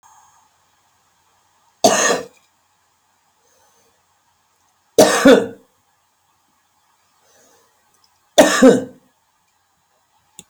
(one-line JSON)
{"three_cough_length": "10.5 s", "three_cough_amplitude": 32768, "three_cough_signal_mean_std_ratio": 0.26, "survey_phase": "beta (2021-08-13 to 2022-03-07)", "age": "45-64", "gender": "Female", "wearing_mask": "No", "symptom_none": true, "smoker_status": "Current smoker (11 or more cigarettes per day)", "respiratory_condition_asthma": false, "respiratory_condition_other": false, "recruitment_source": "REACT", "submission_delay": "1 day", "covid_test_result": "Negative", "covid_test_method": "RT-qPCR", "influenza_a_test_result": "Negative", "influenza_b_test_result": "Negative"}